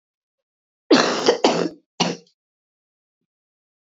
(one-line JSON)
{"three_cough_length": "3.8 s", "three_cough_amplitude": 26048, "three_cough_signal_mean_std_ratio": 0.34, "survey_phase": "beta (2021-08-13 to 2022-03-07)", "age": "18-44", "gender": "Female", "wearing_mask": "No", "symptom_cough_any": true, "symptom_runny_or_blocked_nose": true, "symptom_fatigue": true, "smoker_status": "Never smoked", "respiratory_condition_asthma": true, "respiratory_condition_other": false, "recruitment_source": "REACT", "submission_delay": "1 day", "covid_test_result": "Negative", "covid_test_method": "RT-qPCR", "influenza_a_test_result": "Unknown/Void", "influenza_b_test_result": "Unknown/Void"}